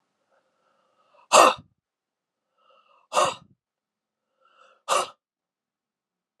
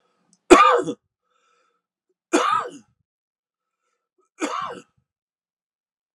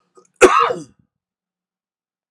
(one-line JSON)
{"exhalation_length": "6.4 s", "exhalation_amplitude": 32507, "exhalation_signal_mean_std_ratio": 0.21, "three_cough_length": "6.1 s", "three_cough_amplitude": 32768, "three_cough_signal_mean_std_ratio": 0.26, "cough_length": "2.3 s", "cough_amplitude": 32768, "cough_signal_mean_std_ratio": 0.28, "survey_phase": "alpha (2021-03-01 to 2021-08-12)", "age": "45-64", "gender": "Male", "wearing_mask": "No", "symptom_cough_any": true, "symptom_shortness_of_breath": true, "symptom_change_to_sense_of_smell_or_taste": true, "symptom_onset": "11 days", "smoker_status": "Ex-smoker", "respiratory_condition_asthma": false, "respiratory_condition_other": false, "recruitment_source": "Test and Trace", "submission_delay": "2 days", "covid_test_result": "Positive", "covid_test_method": "RT-qPCR", "covid_ct_value": 24.7, "covid_ct_gene": "ORF1ab gene"}